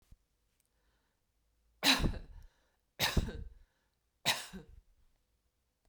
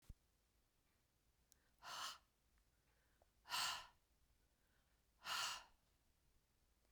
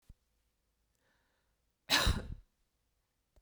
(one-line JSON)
{"three_cough_length": "5.9 s", "three_cough_amplitude": 7359, "three_cough_signal_mean_std_ratio": 0.3, "exhalation_length": "6.9 s", "exhalation_amplitude": 827, "exhalation_signal_mean_std_ratio": 0.34, "cough_length": "3.4 s", "cough_amplitude": 5787, "cough_signal_mean_std_ratio": 0.26, "survey_phase": "beta (2021-08-13 to 2022-03-07)", "age": "65+", "gender": "Female", "wearing_mask": "No", "symptom_none": true, "symptom_onset": "12 days", "smoker_status": "Never smoked", "respiratory_condition_asthma": false, "respiratory_condition_other": false, "recruitment_source": "REACT", "submission_delay": "1 day", "covid_test_result": "Negative", "covid_test_method": "RT-qPCR"}